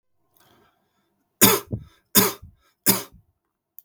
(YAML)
three_cough_length: 3.8 s
three_cough_amplitude: 32768
three_cough_signal_mean_std_ratio: 0.28
survey_phase: beta (2021-08-13 to 2022-03-07)
age: 18-44
gender: Male
wearing_mask: 'No'
symptom_none: true
symptom_onset: 7 days
smoker_status: Never smoked
respiratory_condition_asthma: false
respiratory_condition_other: false
recruitment_source: REACT
submission_delay: 3 days
covid_test_result: Positive
covid_test_method: RT-qPCR
covid_ct_value: 25.0
covid_ct_gene: N gene
influenza_a_test_result: Negative
influenza_b_test_result: Negative